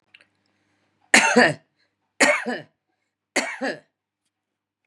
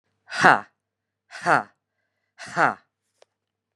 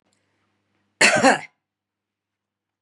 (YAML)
three_cough_length: 4.9 s
three_cough_amplitude: 31762
three_cough_signal_mean_std_ratio: 0.32
exhalation_length: 3.8 s
exhalation_amplitude: 32287
exhalation_signal_mean_std_ratio: 0.26
cough_length: 2.8 s
cough_amplitude: 32142
cough_signal_mean_std_ratio: 0.27
survey_phase: beta (2021-08-13 to 2022-03-07)
age: 45-64
gender: Female
wearing_mask: 'No'
symptom_none: true
smoker_status: Ex-smoker
respiratory_condition_asthma: false
respiratory_condition_other: false
recruitment_source: REACT
submission_delay: 1 day
covid_test_result: Negative
covid_test_method: RT-qPCR
influenza_a_test_result: Negative
influenza_b_test_result: Negative